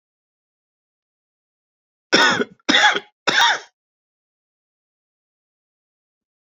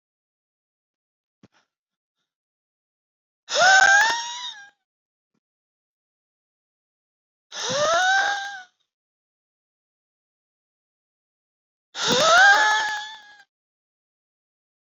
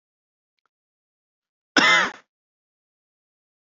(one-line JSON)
{"three_cough_length": "6.5 s", "three_cough_amplitude": 29188, "three_cough_signal_mean_std_ratio": 0.29, "exhalation_length": "14.8 s", "exhalation_amplitude": 19597, "exhalation_signal_mean_std_ratio": 0.33, "cough_length": "3.7 s", "cough_amplitude": 27376, "cough_signal_mean_std_ratio": 0.24, "survey_phase": "beta (2021-08-13 to 2022-03-07)", "age": "45-64", "gender": "Male", "wearing_mask": "No", "symptom_loss_of_taste": true, "symptom_onset": "3 days", "smoker_status": "Never smoked", "respiratory_condition_asthma": false, "respiratory_condition_other": false, "recruitment_source": "Test and Trace", "submission_delay": "2 days", "covid_test_result": "Positive", "covid_test_method": "RT-qPCR", "covid_ct_value": 15.0, "covid_ct_gene": "ORF1ab gene", "covid_ct_mean": 15.3, "covid_viral_load": "9600000 copies/ml", "covid_viral_load_category": "High viral load (>1M copies/ml)"}